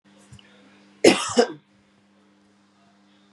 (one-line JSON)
{"cough_length": "3.3 s", "cough_amplitude": 32577, "cough_signal_mean_std_ratio": 0.24, "survey_phase": "beta (2021-08-13 to 2022-03-07)", "age": "45-64", "gender": "Female", "wearing_mask": "No", "symptom_cough_any": true, "symptom_runny_or_blocked_nose": true, "symptom_fatigue": true, "symptom_fever_high_temperature": true, "symptom_headache": true, "symptom_other": true, "smoker_status": "Never smoked", "respiratory_condition_asthma": false, "respiratory_condition_other": false, "recruitment_source": "Test and Trace", "submission_delay": "1 day", "covid_test_result": "Positive", "covid_test_method": "RT-qPCR", "covid_ct_value": 30.8, "covid_ct_gene": "N gene"}